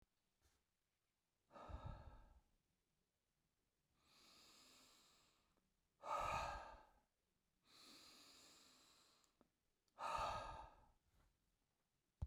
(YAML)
exhalation_length: 12.3 s
exhalation_amplitude: 790
exhalation_signal_mean_std_ratio: 0.35
survey_phase: beta (2021-08-13 to 2022-03-07)
age: 45-64
gender: Male
wearing_mask: 'No'
symptom_none: true
smoker_status: Never smoked
respiratory_condition_asthma: false
respiratory_condition_other: false
recruitment_source: REACT
submission_delay: 1 day
covid_test_result: Negative
covid_test_method: RT-qPCR